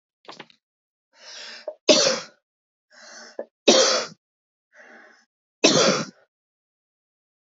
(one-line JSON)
{"three_cough_length": "7.6 s", "three_cough_amplitude": 26114, "three_cough_signal_mean_std_ratio": 0.31, "survey_phase": "beta (2021-08-13 to 2022-03-07)", "age": "18-44", "gender": "Female", "wearing_mask": "No", "symptom_runny_or_blocked_nose": true, "symptom_shortness_of_breath": true, "symptom_sore_throat": true, "symptom_abdominal_pain": true, "symptom_fatigue": true, "symptom_headache": true, "smoker_status": "Ex-smoker", "respiratory_condition_asthma": false, "respiratory_condition_other": false, "recruitment_source": "Test and Trace", "submission_delay": "2 days", "covid_test_result": "Positive", "covid_test_method": "RT-qPCR", "covid_ct_value": 16.4, "covid_ct_gene": "ORF1ab gene", "covid_ct_mean": 16.4, "covid_viral_load": "4000000 copies/ml", "covid_viral_load_category": "High viral load (>1M copies/ml)"}